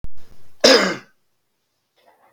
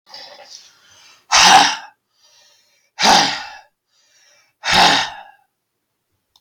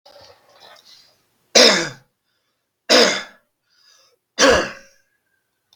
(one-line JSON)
{"cough_length": "2.3 s", "cough_amplitude": 32767, "cough_signal_mean_std_ratio": 0.42, "exhalation_length": "6.4 s", "exhalation_amplitude": 32768, "exhalation_signal_mean_std_ratio": 0.37, "three_cough_length": "5.8 s", "three_cough_amplitude": 32768, "three_cough_signal_mean_std_ratio": 0.31, "survey_phase": "beta (2021-08-13 to 2022-03-07)", "age": "45-64", "gender": "Male", "wearing_mask": "No", "symptom_fatigue": true, "symptom_change_to_sense_of_smell_or_taste": true, "smoker_status": "Current smoker (1 to 10 cigarettes per day)", "respiratory_condition_asthma": false, "respiratory_condition_other": false, "recruitment_source": "REACT", "submission_delay": "1 day", "covid_test_result": "Negative", "covid_test_method": "RT-qPCR", "influenza_a_test_result": "Negative", "influenza_b_test_result": "Negative"}